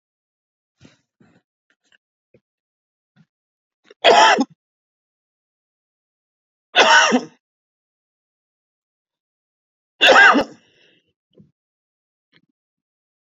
{"three_cough_length": "13.4 s", "three_cough_amplitude": 30385, "three_cough_signal_mean_std_ratio": 0.25, "survey_phase": "beta (2021-08-13 to 2022-03-07)", "age": "45-64", "gender": "Male", "wearing_mask": "Yes", "symptom_none": true, "smoker_status": "Never smoked", "respiratory_condition_asthma": false, "respiratory_condition_other": false, "recruitment_source": "REACT", "submission_delay": "10 days", "covid_test_result": "Negative", "covid_test_method": "RT-qPCR", "influenza_a_test_result": "Negative", "influenza_b_test_result": "Negative"}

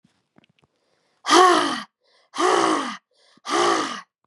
{"exhalation_length": "4.3 s", "exhalation_amplitude": 28603, "exhalation_signal_mean_std_ratio": 0.47, "survey_phase": "beta (2021-08-13 to 2022-03-07)", "age": "45-64", "gender": "Female", "wearing_mask": "No", "symptom_runny_or_blocked_nose": true, "symptom_onset": "12 days", "smoker_status": "Never smoked", "respiratory_condition_asthma": false, "respiratory_condition_other": false, "recruitment_source": "REACT", "submission_delay": "1 day", "covid_test_result": "Negative", "covid_test_method": "RT-qPCR", "influenza_a_test_result": "Negative", "influenza_b_test_result": "Negative"}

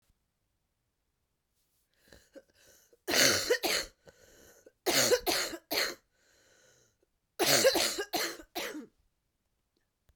{"three_cough_length": "10.2 s", "three_cough_amplitude": 17137, "three_cough_signal_mean_std_ratio": 0.39, "survey_phase": "beta (2021-08-13 to 2022-03-07)", "age": "45-64", "gender": "Female", "wearing_mask": "No", "symptom_cough_any": true, "symptom_runny_or_blocked_nose": true, "symptom_other": true, "symptom_onset": "3 days", "smoker_status": "Never smoked", "respiratory_condition_asthma": false, "respiratory_condition_other": false, "recruitment_source": "Test and Trace", "submission_delay": "1 day", "covid_test_result": "Positive", "covid_test_method": "RT-qPCR", "covid_ct_value": 38.3, "covid_ct_gene": "N gene"}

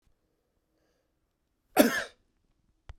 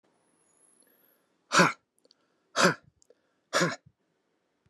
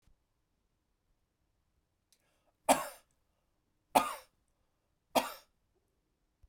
{"cough_length": "3.0 s", "cough_amplitude": 16750, "cough_signal_mean_std_ratio": 0.2, "exhalation_length": "4.7 s", "exhalation_amplitude": 14749, "exhalation_signal_mean_std_ratio": 0.27, "three_cough_length": "6.5 s", "three_cough_amplitude": 9357, "three_cough_signal_mean_std_ratio": 0.18, "survey_phase": "beta (2021-08-13 to 2022-03-07)", "age": "45-64", "gender": "Male", "wearing_mask": "No", "symptom_runny_or_blocked_nose": true, "symptom_onset": "5 days", "smoker_status": "Ex-smoker", "respiratory_condition_asthma": false, "respiratory_condition_other": false, "recruitment_source": "Test and Trace", "submission_delay": "1 day", "covid_test_result": "Positive", "covid_test_method": "RT-qPCR", "covid_ct_value": 17.1, "covid_ct_gene": "ORF1ab gene", "covid_ct_mean": 18.1, "covid_viral_load": "1100000 copies/ml", "covid_viral_load_category": "High viral load (>1M copies/ml)"}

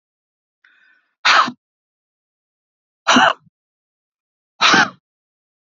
{"exhalation_length": "5.7 s", "exhalation_amplitude": 31240, "exhalation_signal_mean_std_ratio": 0.29, "survey_phase": "beta (2021-08-13 to 2022-03-07)", "age": "45-64", "gender": "Female", "wearing_mask": "No", "symptom_none": true, "symptom_onset": "5 days", "smoker_status": "Ex-smoker", "respiratory_condition_asthma": true, "respiratory_condition_other": false, "recruitment_source": "REACT", "submission_delay": "3 days", "covid_test_result": "Negative", "covid_test_method": "RT-qPCR", "influenza_a_test_result": "Negative", "influenza_b_test_result": "Negative"}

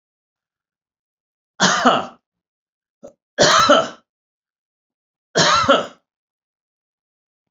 {"three_cough_length": "7.5 s", "three_cough_amplitude": 30074, "three_cough_signal_mean_std_ratio": 0.34, "survey_phase": "beta (2021-08-13 to 2022-03-07)", "age": "65+", "gender": "Male", "wearing_mask": "No", "symptom_runny_or_blocked_nose": true, "symptom_abdominal_pain": true, "smoker_status": "Ex-smoker", "respiratory_condition_asthma": false, "respiratory_condition_other": false, "recruitment_source": "REACT", "submission_delay": "2 days", "covid_test_result": "Negative", "covid_test_method": "RT-qPCR"}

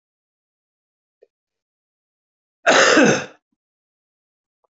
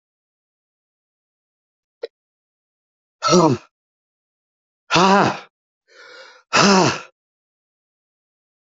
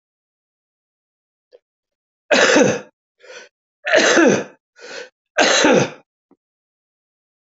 {"cough_length": "4.7 s", "cough_amplitude": 25137, "cough_signal_mean_std_ratio": 0.27, "exhalation_length": "8.6 s", "exhalation_amplitude": 26285, "exhalation_signal_mean_std_ratio": 0.3, "three_cough_length": "7.6 s", "three_cough_amplitude": 28907, "three_cough_signal_mean_std_ratio": 0.38, "survey_phase": "beta (2021-08-13 to 2022-03-07)", "age": "65+", "gender": "Male", "wearing_mask": "No", "symptom_cough_any": true, "smoker_status": "Never smoked", "respiratory_condition_asthma": false, "respiratory_condition_other": true, "recruitment_source": "REACT", "submission_delay": "1 day", "covid_test_result": "Negative", "covid_test_method": "RT-qPCR", "influenza_a_test_result": "Negative", "influenza_b_test_result": "Negative"}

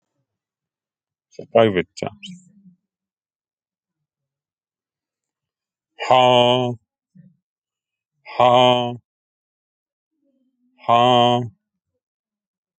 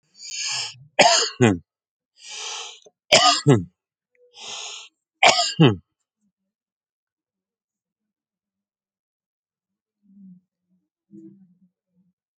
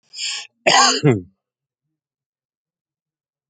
{"exhalation_length": "12.8 s", "exhalation_amplitude": 27486, "exhalation_signal_mean_std_ratio": 0.3, "three_cough_length": "12.4 s", "three_cough_amplitude": 32768, "three_cough_signal_mean_std_ratio": 0.29, "cough_length": "3.5 s", "cough_amplitude": 29524, "cough_signal_mean_std_ratio": 0.33, "survey_phase": "alpha (2021-03-01 to 2021-08-12)", "age": "45-64", "gender": "Male", "wearing_mask": "No", "symptom_none": true, "smoker_status": "Never smoked", "respiratory_condition_asthma": false, "respiratory_condition_other": false, "recruitment_source": "REACT", "submission_delay": "6 days", "covid_test_result": "Negative", "covid_test_method": "RT-qPCR"}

